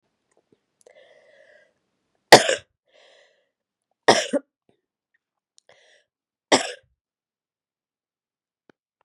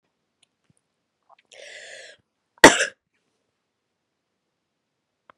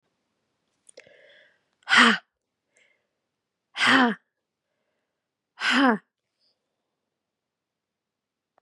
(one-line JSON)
{"three_cough_length": "9.0 s", "three_cough_amplitude": 32768, "three_cough_signal_mean_std_ratio": 0.16, "cough_length": "5.4 s", "cough_amplitude": 32768, "cough_signal_mean_std_ratio": 0.13, "exhalation_length": "8.6 s", "exhalation_amplitude": 27932, "exhalation_signal_mean_std_ratio": 0.26, "survey_phase": "beta (2021-08-13 to 2022-03-07)", "age": "45-64", "gender": "Female", "wearing_mask": "No", "symptom_cough_any": true, "smoker_status": "Never smoked", "respiratory_condition_asthma": false, "respiratory_condition_other": false, "recruitment_source": "REACT", "submission_delay": "4 days", "covid_test_result": "Positive", "covid_test_method": "RT-qPCR", "covid_ct_value": 37.5, "covid_ct_gene": "E gene", "influenza_a_test_result": "Negative", "influenza_b_test_result": "Negative"}